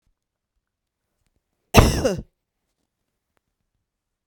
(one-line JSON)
{"cough_length": "4.3 s", "cough_amplitude": 32768, "cough_signal_mean_std_ratio": 0.21, "survey_phase": "beta (2021-08-13 to 2022-03-07)", "age": "45-64", "gender": "Female", "wearing_mask": "No", "symptom_none": true, "smoker_status": "Never smoked", "respiratory_condition_asthma": false, "respiratory_condition_other": false, "recruitment_source": "REACT", "submission_delay": "1 day", "covid_test_result": "Negative", "covid_test_method": "RT-qPCR", "influenza_a_test_result": "Negative", "influenza_b_test_result": "Negative"}